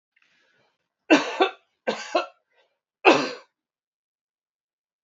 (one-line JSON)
{"three_cough_length": "5.0 s", "three_cough_amplitude": 30466, "three_cough_signal_mean_std_ratio": 0.27, "survey_phase": "beta (2021-08-13 to 2022-03-07)", "age": "45-64", "gender": "Male", "wearing_mask": "No", "symptom_none": true, "smoker_status": "Never smoked", "respiratory_condition_asthma": false, "respiratory_condition_other": false, "recruitment_source": "REACT", "submission_delay": "1 day", "covid_test_result": "Negative", "covid_test_method": "RT-qPCR"}